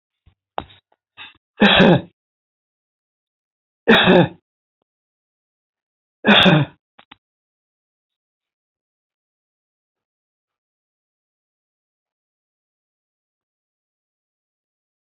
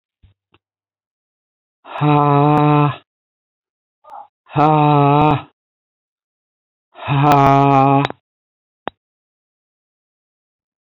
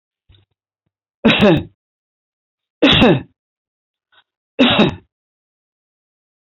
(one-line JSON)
{"three_cough_length": "15.1 s", "three_cough_amplitude": 30579, "three_cough_signal_mean_std_ratio": 0.22, "exhalation_length": "10.8 s", "exhalation_amplitude": 29808, "exhalation_signal_mean_std_ratio": 0.43, "cough_length": "6.6 s", "cough_amplitude": 32768, "cough_signal_mean_std_ratio": 0.33, "survey_phase": "alpha (2021-03-01 to 2021-08-12)", "age": "65+", "gender": "Male", "wearing_mask": "No", "symptom_none": true, "smoker_status": "Ex-smoker", "respiratory_condition_asthma": false, "respiratory_condition_other": false, "recruitment_source": "REACT", "submission_delay": "2 days", "covid_test_result": "Negative", "covid_test_method": "RT-qPCR"}